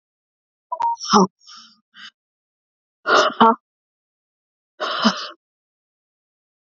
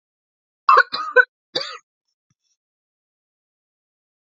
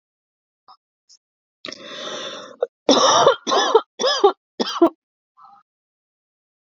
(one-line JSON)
{"exhalation_length": "6.7 s", "exhalation_amplitude": 28542, "exhalation_signal_mean_std_ratio": 0.31, "three_cough_length": "4.4 s", "three_cough_amplitude": 27410, "three_cough_signal_mean_std_ratio": 0.22, "cough_length": "6.7 s", "cough_amplitude": 27349, "cough_signal_mean_std_ratio": 0.37, "survey_phase": "beta (2021-08-13 to 2022-03-07)", "age": "45-64", "gender": "Female", "wearing_mask": "Yes", "symptom_cough_any": true, "symptom_runny_or_blocked_nose": true, "symptom_sore_throat": true, "symptom_headache": true, "symptom_onset": "3 days", "smoker_status": "Ex-smoker", "respiratory_condition_asthma": false, "respiratory_condition_other": false, "recruitment_source": "Test and Trace", "submission_delay": "2 days", "covid_test_result": "Positive", "covid_test_method": "RT-qPCR", "covid_ct_value": 19.7, "covid_ct_gene": "ORF1ab gene"}